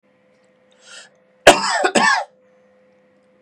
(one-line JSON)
{"cough_length": "3.4 s", "cough_amplitude": 32768, "cough_signal_mean_std_ratio": 0.32, "survey_phase": "beta (2021-08-13 to 2022-03-07)", "age": "45-64", "gender": "Male", "wearing_mask": "No", "symptom_none": true, "smoker_status": "Never smoked", "respiratory_condition_asthma": false, "respiratory_condition_other": false, "recruitment_source": "REACT", "submission_delay": "2 days", "covid_test_result": "Negative", "covid_test_method": "RT-qPCR", "influenza_a_test_result": "Negative", "influenza_b_test_result": "Negative"}